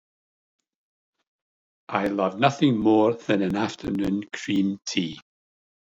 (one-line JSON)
{"exhalation_length": "6.0 s", "exhalation_amplitude": 15988, "exhalation_signal_mean_std_ratio": 0.54, "survey_phase": "beta (2021-08-13 to 2022-03-07)", "age": "65+", "gender": "Male", "wearing_mask": "No", "symptom_none": true, "smoker_status": "Ex-smoker", "respiratory_condition_asthma": false, "respiratory_condition_other": false, "recruitment_source": "REACT", "submission_delay": "2 days", "covid_test_result": "Negative", "covid_test_method": "RT-qPCR", "influenza_a_test_result": "Negative", "influenza_b_test_result": "Negative"}